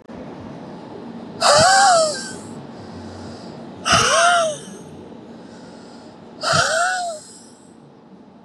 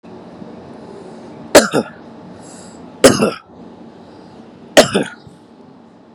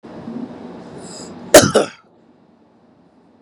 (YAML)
exhalation_length: 8.4 s
exhalation_amplitude: 26961
exhalation_signal_mean_std_ratio: 0.54
three_cough_length: 6.1 s
three_cough_amplitude: 32768
three_cough_signal_mean_std_ratio: 0.32
cough_length: 3.4 s
cough_amplitude: 32768
cough_signal_mean_std_ratio: 0.28
survey_phase: beta (2021-08-13 to 2022-03-07)
age: 18-44
gender: Male
wearing_mask: 'No'
symptom_none: true
smoker_status: Ex-smoker
respiratory_condition_asthma: true
respiratory_condition_other: false
recruitment_source: REACT
submission_delay: 2 days
covid_test_result: Negative
covid_test_method: RT-qPCR
influenza_a_test_result: Unknown/Void
influenza_b_test_result: Unknown/Void